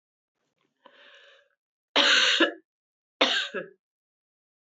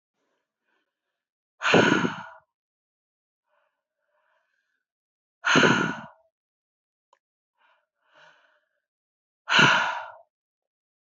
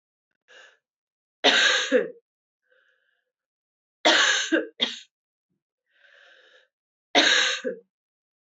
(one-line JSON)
{"cough_length": "4.7 s", "cough_amplitude": 17084, "cough_signal_mean_std_ratio": 0.34, "exhalation_length": "11.2 s", "exhalation_amplitude": 20684, "exhalation_signal_mean_std_ratio": 0.28, "three_cough_length": "8.4 s", "three_cough_amplitude": 20655, "three_cough_signal_mean_std_ratio": 0.37, "survey_phase": "beta (2021-08-13 to 2022-03-07)", "age": "18-44", "gender": "Female", "wearing_mask": "No", "symptom_cough_any": true, "symptom_runny_or_blocked_nose": true, "symptom_fatigue": true, "symptom_headache": true, "symptom_onset": "3 days", "smoker_status": "Never smoked", "respiratory_condition_asthma": false, "respiratory_condition_other": false, "recruitment_source": "Test and Trace", "submission_delay": "1 day", "covid_test_result": "Positive", "covid_test_method": "RT-qPCR", "covid_ct_value": 13.1, "covid_ct_gene": "ORF1ab gene", "covid_ct_mean": 13.7, "covid_viral_load": "32000000 copies/ml", "covid_viral_load_category": "High viral load (>1M copies/ml)"}